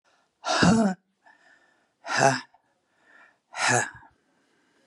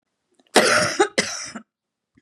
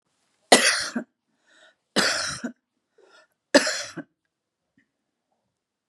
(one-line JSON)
{"exhalation_length": "4.9 s", "exhalation_amplitude": 17231, "exhalation_signal_mean_std_ratio": 0.38, "cough_length": "2.2 s", "cough_amplitude": 32768, "cough_signal_mean_std_ratio": 0.43, "three_cough_length": "5.9 s", "three_cough_amplitude": 31412, "three_cough_signal_mean_std_ratio": 0.29, "survey_phase": "beta (2021-08-13 to 2022-03-07)", "age": "45-64", "gender": "Female", "wearing_mask": "No", "symptom_none": true, "symptom_onset": "12 days", "smoker_status": "Ex-smoker", "respiratory_condition_asthma": false, "respiratory_condition_other": false, "recruitment_source": "REACT", "submission_delay": "1 day", "covid_test_result": "Negative", "covid_test_method": "RT-qPCR", "influenza_a_test_result": "Negative", "influenza_b_test_result": "Negative"}